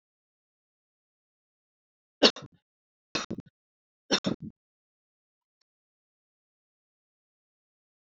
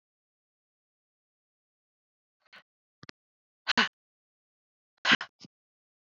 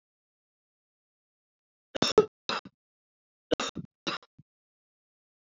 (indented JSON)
{
  "three_cough_length": "8.0 s",
  "three_cough_amplitude": 19263,
  "three_cough_signal_mean_std_ratio": 0.15,
  "exhalation_length": "6.1 s",
  "exhalation_amplitude": 13762,
  "exhalation_signal_mean_std_ratio": 0.16,
  "cough_length": "5.5 s",
  "cough_amplitude": 15961,
  "cough_signal_mean_std_ratio": 0.19,
  "survey_phase": "alpha (2021-03-01 to 2021-08-12)",
  "age": "45-64",
  "gender": "Female",
  "wearing_mask": "No",
  "symptom_none": true,
  "smoker_status": "Current smoker (e-cigarettes or vapes only)",
  "respiratory_condition_asthma": false,
  "respiratory_condition_other": false,
  "recruitment_source": "Test and Trace",
  "submission_delay": "3 days",
  "covid_test_result": "Negative",
  "covid_test_method": "ePCR"
}